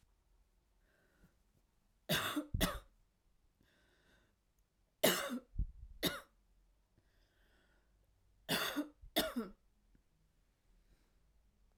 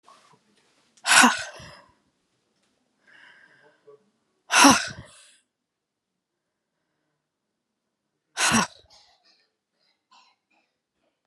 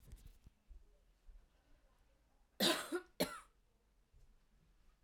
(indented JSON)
{
  "three_cough_length": "11.8 s",
  "three_cough_amplitude": 6413,
  "three_cough_signal_mean_std_ratio": 0.32,
  "exhalation_length": "11.3 s",
  "exhalation_amplitude": 28211,
  "exhalation_signal_mean_std_ratio": 0.22,
  "cough_length": "5.0 s",
  "cough_amplitude": 2746,
  "cough_signal_mean_std_ratio": 0.29,
  "survey_phase": "beta (2021-08-13 to 2022-03-07)",
  "age": "18-44",
  "gender": "Female",
  "wearing_mask": "No",
  "symptom_cough_any": true,
  "symptom_new_continuous_cough": true,
  "symptom_runny_or_blocked_nose": true,
  "symptom_shortness_of_breath": true,
  "symptom_sore_throat": true,
  "symptom_fatigue": true,
  "symptom_other": true,
  "symptom_onset": "2 days",
  "smoker_status": "Never smoked",
  "respiratory_condition_asthma": true,
  "respiratory_condition_other": false,
  "recruitment_source": "Test and Trace",
  "submission_delay": "1 day",
  "covid_test_result": "Positive",
  "covid_test_method": "RT-qPCR",
  "covid_ct_value": 27.1,
  "covid_ct_gene": "ORF1ab gene",
  "covid_ct_mean": 27.9,
  "covid_viral_load": "710 copies/ml",
  "covid_viral_load_category": "Minimal viral load (< 10K copies/ml)"
}